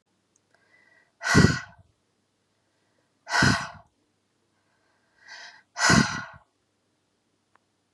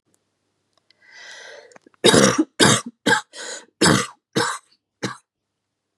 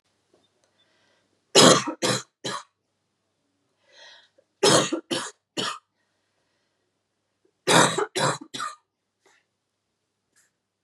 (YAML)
exhalation_length: 7.9 s
exhalation_amplitude: 23122
exhalation_signal_mean_std_ratio: 0.28
cough_length: 6.0 s
cough_amplitude: 32768
cough_signal_mean_std_ratio: 0.37
three_cough_length: 10.8 s
three_cough_amplitude: 30763
three_cough_signal_mean_std_ratio: 0.29
survey_phase: beta (2021-08-13 to 2022-03-07)
age: 18-44
gender: Female
wearing_mask: 'No'
symptom_cough_any: true
symptom_runny_or_blocked_nose: true
symptom_shortness_of_breath: true
symptom_fatigue: true
symptom_change_to_sense_of_smell_or_taste: true
symptom_onset: 4 days
smoker_status: Never smoked
respiratory_condition_asthma: false
respiratory_condition_other: false
recruitment_source: Test and Trace
submission_delay: 2 days
covid_test_result: Positive
covid_test_method: RT-qPCR
covid_ct_value: 18.4
covid_ct_gene: N gene